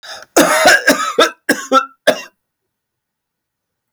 {"cough_length": "3.9 s", "cough_amplitude": 32768, "cough_signal_mean_std_ratio": 0.45, "survey_phase": "alpha (2021-03-01 to 2021-08-12)", "age": "45-64", "gender": "Male", "wearing_mask": "No", "symptom_none": true, "symptom_onset": "12 days", "smoker_status": "Ex-smoker", "respiratory_condition_asthma": false, "respiratory_condition_other": false, "recruitment_source": "REACT", "submission_delay": "1 day", "covid_test_result": "Negative", "covid_test_method": "RT-qPCR"}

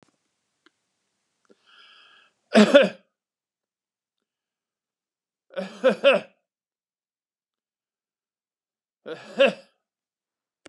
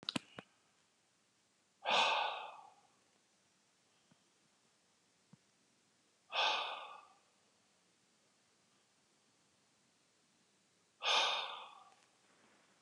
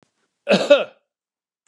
{"three_cough_length": "10.7 s", "three_cough_amplitude": 28170, "three_cough_signal_mean_std_ratio": 0.21, "exhalation_length": "12.8 s", "exhalation_amplitude": 4371, "exhalation_signal_mean_std_ratio": 0.3, "cough_length": "1.7 s", "cough_amplitude": 31376, "cough_signal_mean_std_ratio": 0.32, "survey_phase": "beta (2021-08-13 to 2022-03-07)", "age": "65+", "gender": "Male", "wearing_mask": "No", "symptom_cough_any": true, "symptom_diarrhoea": true, "symptom_onset": "12 days", "smoker_status": "Ex-smoker", "respiratory_condition_asthma": false, "respiratory_condition_other": false, "recruitment_source": "REACT", "submission_delay": "5 days", "covid_test_result": "Negative", "covid_test_method": "RT-qPCR", "influenza_a_test_result": "Negative", "influenza_b_test_result": "Negative"}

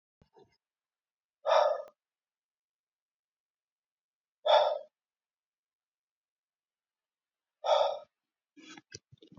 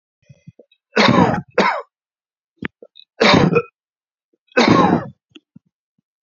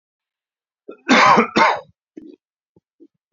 {"exhalation_length": "9.4 s", "exhalation_amplitude": 9132, "exhalation_signal_mean_std_ratio": 0.26, "three_cough_length": "6.2 s", "three_cough_amplitude": 32767, "three_cough_signal_mean_std_ratio": 0.4, "cough_length": "3.3 s", "cough_amplitude": 29141, "cough_signal_mean_std_ratio": 0.35, "survey_phase": "beta (2021-08-13 to 2022-03-07)", "age": "18-44", "gender": "Male", "wearing_mask": "No", "symptom_abdominal_pain": true, "smoker_status": "Current smoker (e-cigarettes or vapes only)", "respiratory_condition_asthma": false, "respiratory_condition_other": false, "recruitment_source": "REACT", "submission_delay": "1 day", "covid_test_result": "Negative", "covid_test_method": "RT-qPCR", "influenza_a_test_result": "Negative", "influenza_b_test_result": "Negative"}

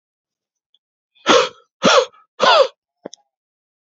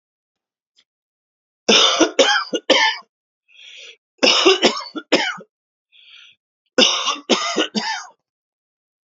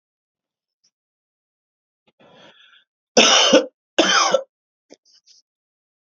{"exhalation_length": "3.8 s", "exhalation_amplitude": 29344, "exhalation_signal_mean_std_ratio": 0.35, "three_cough_length": "9.0 s", "three_cough_amplitude": 31229, "three_cough_signal_mean_std_ratio": 0.43, "cough_length": "6.1 s", "cough_amplitude": 32768, "cough_signal_mean_std_ratio": 0.3, "survey_phase": "alpha (2021-03-01 to 2021-08-12)", "age": "18-44", "gender": "Male", "wearing_mask": "No", "symptom_none": true, "smoker_status": "Ex-smoker", "respiratory_condition_asthma": false, "respiratory_condition_other": false, "recruitment_source": "Test and Trace", "submission_delay": "2 days", "covid_test_result": "Positive", "covid_test_method": "RT-qPCR", "covid_ct_value": 33.4, "covid_ct_gene": "ORF1ab gene"}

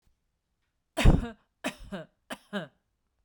{"three_cough_length": "3.2 s", "three_cough_amplitude": 16015, "three_cough_signal_mean_std_ratio": 0.26, "survey_phase": "beta (2021-08-13 to 2022-03-07)", "age": "45-64", "gender": "Female", "wearing_mask": "No", "symptom_none": true, "smoker_status": "Never smoked", "respiratory_condition_asthma": false, "respiratory_condition_other": false, "recruitment_source": "REACT", "submission_delay": "1 day", "covid_test_result": "Negative", "covid_test_method": "RT-qPCR", "influenza_a_test_result": "Negative", "influenza_b_test_result": "Negative"}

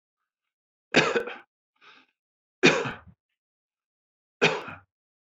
{"three_cough_length": "5.4 s", "three_cough_amplitude": 19029, "three_cough_signal_mean_std_ratio": 0.28, "survey_phase": "beta (2021-08-13 to 2022-03-07)", "age": "45-64", "gender": "Male", "wearing_mask": "No", "symptom_none": true, "smoker_status": "Never smoked", "respiratory_condition_asthma": false, "respiratory_condition_other": false, "recruitment_source": "REACT", "submission_delay": "1 day", "covid_test_result": "Negative", "covid_test_method": "RT-qPCR"}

